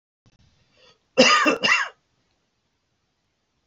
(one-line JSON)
{"cough_length": "3.7 s", "cough_amplitude": 26575, "cough_signal_mean_std_ratio": 0.33, "survey_phase": "beta (2021-08-13 to 2022-03-07)", "age": "65+", "gender": "Male", "wearing_mask": "No", "symptom_none": true, "symptom_onset": "4 days", "smoker_status": "Ex-smoker", "respiratory_condition_asthma": false, "respiratory_condition_other": false, "recruitment_source": "REACT", "submission_delay": "5 days", "covid_test_result": "Negative", "covid_test_method": "RT-qPCR", "influenza_a_test_result": "Negative", "influenza_b_test_result": "Negative"}